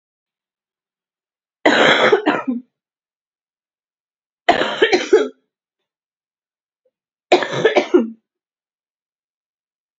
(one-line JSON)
{"three_cough_length": "10.0 s", "three_cough_amplitude": 32768, "three_cough_signal_mean_std_ratio": 0.34, "survey_phase": "beta (2021-08-13 to 2022-03-07)", "age": "18-44", "gender": "Female", "wearing_mask": "No", "symptom_cough_any": true, "symptom_onset": "10 days", "smoker_status": "Never smoked", "respiratory_condition_asthma": false, "respiratory_condition_other": false, "recruitment_source": "REACT", "submission_delay": "13 days", "covid_test_result": "Negative", "covid_test_method": "RT-qPCR", "influenza_a_test_result": "Unknown/Void", "influenza_b_test_result": "Unknown/Void"}